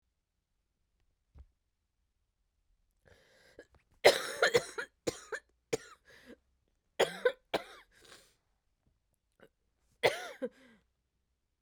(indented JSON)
{
  "three_cough_length": "11.6 s",
  "three_cough_amplitude": 13027,
  "three_cough_signal_mean_std_ratio": 0.22,
  "survey_phase": "beta (2021-08-13 to 2022-03-07)",
  "age": "45-64",
  "gender": "Female",
  "wearing_mask": "No",
  "symptom_cough_any": true,
  "symptom_new_continuous_cough": true,
  "symptom_runny_or_blocked_nose": true,
  "symptom_shortness_of_breath": true,
  "symptom_abdominal_pain": true,
  "symptom_fatigue": true,
  "symptom_headache": true,
  "symptom_change_to_sense_of_smell_or_taste": true,
  "symptom_loss_of_taste": true,
  "symptom_onset": "4 days",
  "smoker_status": "Ex-smoker",
  "respiratory_condition_asthma": false,
  "respiratory_condition_other": false,
  "recruitment_source": "Test and Trace",
  "submission_delay": "1 day",
  "covid_test_result": "Positive",
  "covid_test_method": "RT-qPCR",
  "covid_ct_value": 16.7,
  "covid_ct_gene": "ORF1ab gene",
  "covid_ct_mean": 17.1,
  "covid_viral_load": "2600000 copies/ml",
  "covid_viral_load_category": "High viral load (>1M copies/ml)"
}